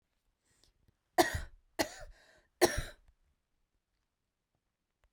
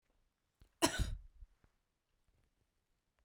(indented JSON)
{
  "three_cough_length": "5.1 s",
  "three_cough_amplitude": 9752,
  "three_cough_signal_mean_std_ratio": 0.22,
  "cough_length": "3.2 s",
  "cough_amplitude": 5438,
  "cough_signal_mean_std_ratio": 0.24,
  "survey_phase": "beta (2021-08-13 to 2022-03-07)",
  "age": "45-64",
  "gender": "Female",
  "wearing_mask": "No",
  "symptom_none": true,
  "symptom_onset": "12 days",
  "smoker_status": "Ex-smoker",
  "respiratory_condition_asthma": true,
  "respiratory_condition_other": false,
  "recruitment_source": "REACT",
  "submission_delay": "5 days",
  "covid_test_result": "Negative",
  "covid_test_method": "RT-qPCR"
}